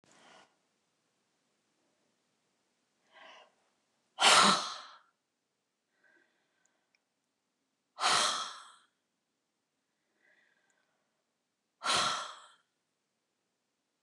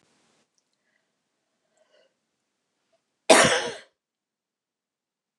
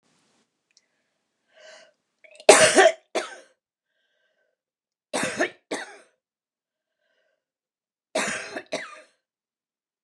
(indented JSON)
{
  "exhalation_length": "14.0 s",
  "exhalation_amplitude": 10099,
  "exhalation_signal_mean_std_ratio": 0.24,
  "cough_length": "5.4 s",
  "cough_amplitude": 29203,
  "cough_signal_mean_std_ratio": 0.19,
  "three_cough_length": "10.0 s",
  "three_cough_amplitude": 29204,
  "three_cough_signal_mean_std_ratio": 0.23,
  "survey_phase": "beta (2021-08-13 to 2022-03-07)",
  "age": "65+",
  "gender": "Female",
  "wearing_mask": "No",
  "symptom_fatigue": true,
  "symptom_headache": true,
  "smoker_status": "Never smoked",
  "respiratory_condition_asthma": false,
  "respiratory_condition_other": false,
  "recruitment_source": "REACT",
  "submission_delay": "1 day",
  "covid_test_result": "Negative",
  "covid_test_method": "RT-qPCR",
  "influenza_a_test_result": "Unknown/Void",
  "influenza_b_test_result": "Unknown/Void"
}